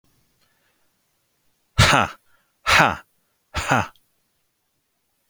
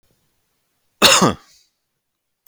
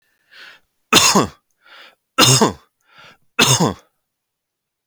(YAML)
exhalation_length: 5.3 s
exhalation_amplitude: 31273
exhalation_signal_mean_std_ratio: 0.3
cough_length: 2.5 s
cough_amplitude: 32768
cough_signal_mean_std_ratio: 0.28
three_cough_length: 4.9 s
three_cough_amplitude: 32768
three_cough_signal_mean_std_ratio: 0.37
survey_phase: beta (2021-08-13 to 2022-03-07)
age: 45-64
gender: Male
wearing_mask: 'No'
symptom_none: true
smoker_status: Ex-smoker
respiratory_condition_asthma: false
respiratory_condition_other: false
recruitment_source: REACT
submission_delay: 12 days
covid_test_result: Negative
covid_test_method: RT-qPCR